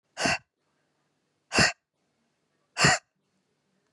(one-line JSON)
{"exhalation_length": "3.9 s", "exhalation_amplitude": 15315, "exhalation_signal_mean_std_ratio": 0.29, "survey_phase": "beta (2021-08-13 to 2022-03-07)", "age": "18-44", "gender": "Female", "wearing_mask": "No", "symptom_none": true, "smoker_status": "Never smoked", "respiratory_condition_asthma": false, "respiratory_condition_other": false, "recruitment_source": "REACT", "submission_delay": "2 days", "covid_test_result": "Negative", "covid_test_method": "RT-qPCR", "influenza_a_test_result": "Negative", "influenza_b_test_result": "Negative"}